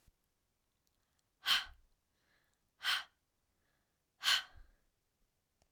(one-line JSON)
{"exhalation_length": "5.7 s", "exhalation_amplitude": 4095, "exhalation_signal_mean_std_ratio": 0.25, "survey_phase": "alpha (2021-03-01 to 2021-08-12)", "age": "45-64", "gender": "Female", "wearing_mask": "No", "symptom_none": true, "smoker_status": "Never smoked", "respiratory_condition_asthma": false, "respiratory_condition_other": false, "recruitment_source": "REACT", "submission_delay": "1 day", "covid_test_result": "Negative", "covid_test_method": "RT-qPCR"}